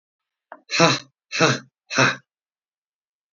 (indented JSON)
{
  "exhalation_length": "3.3 s",
  "exhalation_amplitude": 27708,
  "exhalation_signal_mean_std_ratio": 0.36,
  "survey_phase": "beta (2021-08-13 to 2022-03-07)",
  "age": "65+",
  "gender": "Male",
  "wearing_mask": "No",
  "symptom_none": true,
  "smoker_status": "Never smoked",
  "respiratory_condition_asthma": false,
  "respiratory_condition_other": false,
  "recruitment_source": "REACT",
  "submission_delay": "1 day",
  "covid_test_result": "Negative",
  "covid_test_method": "RT-qPCR",
  "influenza_a_test_result": "Negative",
  "influenza_b_test_result": "Negative"
}